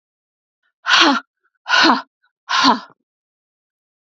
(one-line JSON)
{"exhalation_length": "4.2 s", "exhalation_amplitude": 32768, "exhalation_signal_mean_std_ratio": 0.38, "survey_phase": "beta (2021-08-13 to 2022-03-07)", "age": "45-64", "gender": "Female", "wearing_mask": "No", "symptom_cough_any": true, "symptom_runny_or_blocked_nose": true, "symptom_sore_throat": true, "symptom_headache": true, "symptom_other": true, "symptom_onset": "2 days", "smoker_status": "Never smoked", "respiratory_condition_asthma": false, "respiratory_condition_other": false, "recruitment_source": "Test and Trace", "submission_delay": "1 day", "covid_test_result": "Positive", "covid_test_method": "RT-qPCR", "covid_ct_value": 28.3, "covid_ct_gene": "ORF1ab gene", "covid_ct_mean": 29.2, "covid_viral_load": "260 copies/ml", "covid_viral_load_category": "Minimal viral load (< 10K copies/ml)"}